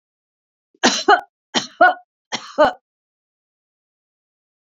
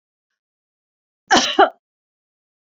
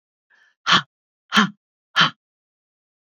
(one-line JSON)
{"three_cough_length": "4.7 s", "three_cough_amplitude": 28796, "three_cough_signal_mean_std_ratio": 0.28, "cough_length": "2.7 s", "cough_amplitude": 29567, "cough_signal_mean_std_ratio": 0.25, "exhalation_length": "3.1 s", "exhalation_amplitude": 28266, "exhalation_signal_mean_std_ratio": 0.28, "survey_phase": "beta (2021-08-13 to 2022-03-07)", "age": "45-64", "gender": "Female", "wearing_mask": "No", "symptom_none": true, "smoker_status": "Never smoked", "respiratory_condition_asthma": false, "respiratory_condition_other": false, "recruitment_source": "REACT", "submission_delay": "2 days", "covid_test_result": "Negative", "covid_test_method": "RT-qPCR", "influenza_a_test_result": "Negative", "influenza_b_test_result": "Negative"}